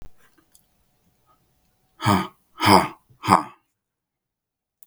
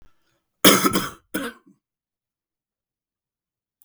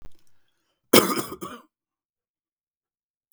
{"exhalation_length": "4.9 s", "exhalation_amplitude": 32766, "exhalation_signal_mean_std_ratio": 0.27, "cough_length": "3.8 s", "cough_amplitude": 32768, "cough_signal_mean_std_ratio": 0.25, "three_cough_length": "3.3 s", "three_cough_amplitude": 32768, "three_cough_signal_mean_std_ratio": 0.23, "survey_phase": "beta (2021-08-13 to 2022-03-07)", "age": "45-64", "gender": "Male", "wearing_mask": "No", "symptom_new_continuous_cough": true, "symptom_runny_or_blocked_nose": true, "symptom_shortness_of_breath": true, "symptom_sore_throat": true, "symptom_fatigue": true, "symptom_onset": "3 days", "smoker_status": "Never smoked", "respiratory_condition_asthma": false, "respiratory_condition_other": false, "recruitment_source": "Test and Trace", "submission_delay": "2 days", "covid_test_result": "Positive", "covid_test_method": "RT-qPCR", "covid_ct_value": 26.5, "covid_ct_gene": "ORF1ab gene", "covid_ct_mean": 26.9, "covid_viral_load": "1500 copies/ml", "covid_viral_load_category": "Minimal viral load (< 10K copies/ml)"}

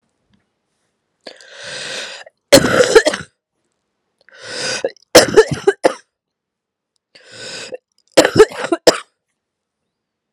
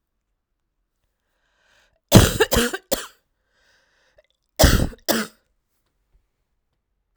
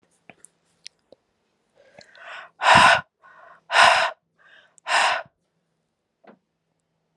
{"three_cough_length": "10.3 s", "three_cough_amplitude": 32768, "three_cough_signal_mean_std_ratio": 0.31, "cough_length": "7.2 s", "cough_amplitude": 32768, "cough_signal_mean_std_ratio": 0.26, "exhalation_length": "7.2 s", "exhalation_amplitude": 30855, "exhalation_signal_mean_std_ratio": 0.31, "survey_phase": "alpha (2021-03-01 to 2021-08-12)", "age": "18-44", "gender": "Female", "wearing_mask": "No", "symptom_cough_any": true, "symptom_new_continuous_cough": true, "symptom_shortness_of_breath": true, "symptom_abdominal_pain": true, "symptom_fatigue": true, "symptom_headache": true, "symptom_onset": "3 days", "smoker_status": "Never smoked", "respiratory_condition_asthma": false, "respiratory_condition_other": false, "recruitment_source": "Test and Trace", "submission_delay": "2 days", "covid_test_result": "Positive", "covid_test_method": "RT-qPCR", "covid_ct_value": 14.1, "covid_ct_gene": "ORF1ab gene", "covid_ct_mean": 14.6, "covid_viral_load": "17000000 copies/ml", "covid_viral_load_category": "High viral load (>1M copies/ml)"}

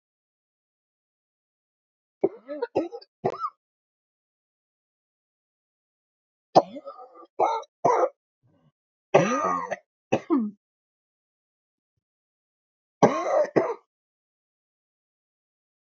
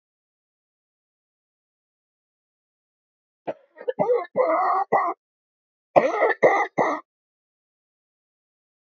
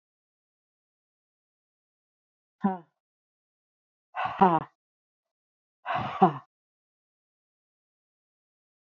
{"three_cough_length": "15.9 s", "three_cough_amplitude": 26134, "three_cough_signal_mean_std_ratio": 0.29, "cough_length": "8.9 s", "cough_amplitude": 28568, "cough_signal_mean_std_ratio": 0.35, "exhalation_length": "8.9 s", "exhalation_amplitude": 20403, "exhalation_signal_mean_std_ratio": 0.2, "survey_phase": "beta (2021-08-13 to 2022-03-07)", "age": "45-64", "gender": "Female", "wearing_mask": "No", "symptom_cough_any": true, "symptom_new_continuous_cough": true, "symptom_runny_or_blocked_nose": true, "symptom_shortness_of_breath": true, "symptom_sore_throat": true, "symptom_fatigue": true, "symptom_fever_high_temperature": true, "symptom_headache": true, "symptom_change_to_sense_of_smell_or_taste": true, "symptom_loss_of_taste": true, "symptom_onset": "6 days", "smoker_status": "Never smoked", "respiratory_condition_asthma": false, "respiratory_condition_other": false, "recruitment_source": "Test and Trace", "submission_delay": "1 day", "covid_test_result": "Positive", "covid_test_method": "RT-qPCR", "covid_ct_value": 26.4, "covid_ct_gene": "ORF1ab gene", "covid_ct_mean": 27.3, "covid_viral_load": "1100 copies/ml", "covid_viral_load_category": "Minimal viral load (< 10K copies/ml)"}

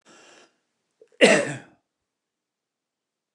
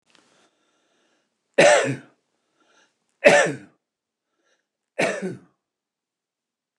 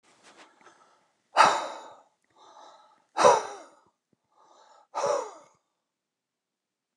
{"cough_length": "3.3 s", "cough_amplitude": 24842, "cough_signal_mean_std_ratio": 0.22, "three_cough_length": "6.8 s", "three_cough_amplitude": 29204, "three_cough_signal_mean_std_ratio": 0.27, "exhalation_length": "7.0 s", "exhalation_amplitude": 18983, "exhalation_signal_mean_std_ratio": 0.27, "survey_phase": "beta (2021-08-13 to 2022-03-07)", "age": "65+", "gender": "Male", "wearing_mask": "No", "symptom_cough_any": true, "smoker_status": "Ex-smoker", "respiratory_condition_asthma": false, "respiratory_condition_other": false, "recruitment_source": "REACT", "submission_delay": "1 day", "covid_test_result": "Negative", "covid_test_method": "RT-qPCR"}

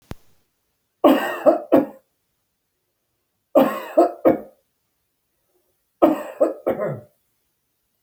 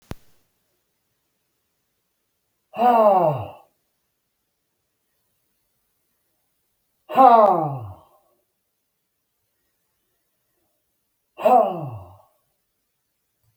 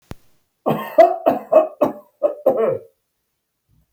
{"three_cough_length": "8.0 s", "three_cough_amplitude": 30792, "three_cough_signal_mean_std_ratio": 0.34, "exhalation_length": "13.6 s", "exhalation_amplitude": 26427, "exhalation_signal_mean_std_ratio": 0.28, "cough_length": "3.9 s", "cough_amplitude": 32701, "cough_signal_mean_std_ratio": 0.42, "survey_phase": "alpha (2021-03-01 to 2021-08-12)", "age": "65+", "gender": "Male", "wearing_mask": "No", "symptom_none": true, "smoker_status": "Ex-smoker", "respiratory_condition_asthma": false, "respiratory_condition_other": false, "recruitment_source": "REACT", "submission_delay": "2 days", "covid_test_result": "Negative", "covid_test_method": "RT-qPCR"}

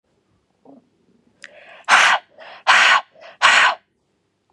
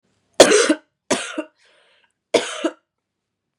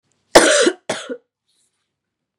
{"exhalation_length": "4.5 s", "exhalation_amplitude": 32416, "exhalation_signal_mean_std_ratio": 0.4, "three_cough_length": "3.6 s", "three_cough_amplitude": 32768, "three_cough_signal_mean_std_ratio": 0.32, "cough_length": "2.4 s", "cough_amplitude": 32768, "cough_signal_mean_std_ratio": 0.33, "survey_phase": "beta (2021-08-13 to 2022-03-07)", "age": "18-44", "gender": "Female", "wearing_mask": "Yes", "symptom_cough_any": true, "symptom_runny_or_blocked_nose": true, "symptom_shortness_of_breath": true, "symptom_sore_throat": true, "symptom_fatigue": true, "symptom_fever_high_temperature": true, "symptom_headache": true, "symptom_onset": "3 days", "smoker_status": "Never smoked", "respiratory_condition_asthma": false, "respiratory_condition_other": false, "recruitment_source": "Test and Trace", "submission_delay": "2 days", "covid_test_result": "Positive", "covid_test_method": "ePCR"}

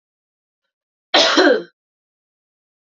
{"cough_length": "3.0 s", "cough_amplitude": 29255, "cough_signal_mean_std_ratio": 0.32, "survey_phase": "beta (2021-08-13 to 2022-03-07)", "age": "18-44", "gender": "Female", "wearing_mask": "No", "symptom_none": true, "smoker_status": "Ex-smoker", "respiratory_condition_asthma": false, "respiratory_condition_other": false, "recruitment_source": "REACT", "submission_delay": "0 days", "covid_test_result": "Negative", "covid_test_method": "RT-qPCR"}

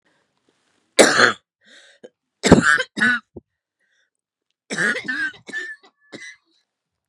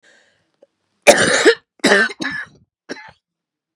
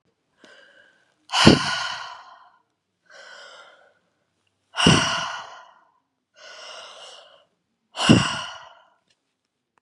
{"three_cough_length": "7.1 s", "three_cough_amplitude": 32768, "three_cough_signal_mean_std_ratio": 0.32, "cough_length": "3.8 s", "cough_amplitude": 32768, "cough_signal_mean_std_ratio": 0.37, "exhalation_length": "9.8 s", "exhalation_amplitude": 32768, "exhalation_signal_mean_std_ratio": 0.3, "survey_phase": "beta (2021-08-13 to 2022-03-07)", "age": "45-64", "gender": "Female", "wearing_mask": "No", "symptom_cough_any": true, "symptom_runny_or_blocked_nose": true, "symptom_sore_throat": true, "symptom_fatigue": true, "symptom_headache": true, "symptom_onset": "3 days", "smoker_status": "Never smoked", "respiratory_condition_asthma": false, "respiratory_condition_other": false, "recruitment_source": "Test and Trace", "submission_delay": "1 day", "covid_test_result": "Positive", "covid_test_method": "RT-qPCR", "covid_ct_value": 18.2, "covid_ct_gene": "ORF1ab gene", "covid_ct_mean": 19.1, "covid_viral_load": "530000 copies/ml", "covid_viral_load_category": "Low viral load (10K-1M copies/ml)"}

